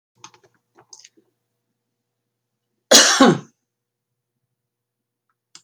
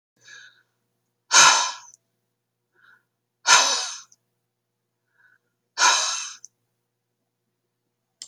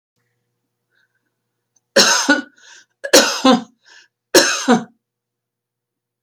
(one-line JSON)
{"cough_length": "5.6 s", "cough_amplitude": 32768, "cough_signal_mean_std_ratio": 0.22, "exhalation_length": "8.3 s", "exhalation_amplitude": 29736, "exhalation_signal_mean_std_ratio": 0.29, "three_cough_length": "6.2 s", "three_cough_amplitude": 32768, "three_cough_signal_mean_std_ratio": 0.35, "survey_phase": "beta (2021-08-13 to 2022-03-07)", "age": "65+", "gender": "Female", "wearing_mask": "No", "symptom_none": true, "smoker_status": "Never smoked", "respiratory_condition_asthma": true, "respiratory_condition_other": false, "recruitment_source": "REACT", "submission_delay": "2 days", "covid_test_result": "Negative", "covid_test_method": "RT-qPCR"}